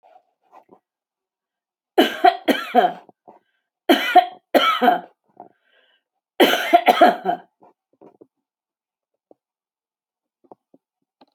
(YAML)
three_cough_length: 11.3 s
three_cough_amplitude: 32613
three_cough_signal_mean_std_ratio: 0.32
survey_phase: alpha (2021-03-01 to 2021-08-12)
age: 45-64
gender: Female
wearing_mask: 'No'
symptom_none: true
smoker_status: Never smoked
respiratory_condition_asthma: false
respiratory_condition_other: false
recruitment_source: REACT
submission_delay: 1 day
covid_test_result: Negative
covid_test_method: RT-qPCR